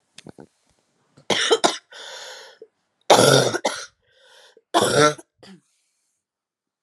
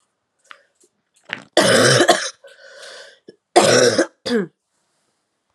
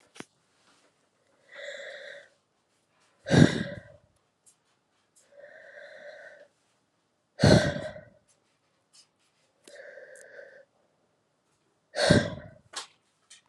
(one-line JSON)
{"three_cough_length": "6.8 s", "three_cough_amplitude": 32751, "three_cough_signal_mean_std_ratio": 0.35, "cough_length": "5.5 s", "cough_amplitude": 32768, "cough_signal_mean_std_ratio": 0.41, "exhalation_length": "13.5 s", "exhalation_amplitude": 24660, "exhalation_signal_mean_std_ratio": 0.24, "survey_phase": "beta (2021-08-13 to 2022-03-07)", "age": "18-44", "gender": "Female", "wearing_mask": "No", "symptom_cough_any": true, "symptom_runny_or_blocked_nose": true, "symptom_sore_throat": true, "symptom_headache": true, "symptom_change_to_sense_of_smell_or_taste": true, "symptom_loss_of_taste": true, "symptom_onset": "6 days", "smoker_status": "Never smoked", "respiratory_condition_asthma": false, "respiratory_condition_other": false, "recruitment_source": "Test and Trace", "submission_delay": "2 days", "covid_test_result": "Positive", "covid_test_method": "RT-qPCR", "covid_ct_value": 14.2, "covid_ct_gene": "ORF1ab gene", "covid_ct_mean": 14.4, "covid_viral_load": "19000000 copies/ml", "covid_viral_load_category": "High viral load (>1M copies/ml)"}